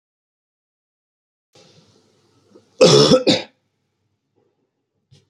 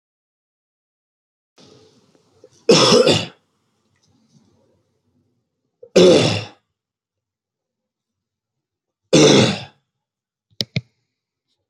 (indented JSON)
{
  "cough_length": "5.3 s",
  "cough_amplitude": 30290,
  "cough_signal_mean_std_ratio": 0.26,
  "three_cough_length": "11.7 s",
  "three_cough_amplitude": 32768,
  "three_cough_signal_mean_std_ratio": 0.29,
  "survey_phase": "beta (2021-08-13 to 2022-03-07)",
  "age": "18-44",
  "gender": "Male",
  "wearing_mask": "No",
  "symptom_none": true,
  "smoker_status": "Never smoked",
  "respiratory_condition_asthma": true,
  "respiratory_condition_other": false,
  "recruitment_source": "REACT",
  "submission_delay": "2 days",
  "covid_test_result": "Negative",
  "covid_test_method": "RT-qPCR",
  "influenza_a_test_result": "Negative",
  "influenza_b_test_result": "Negative"
}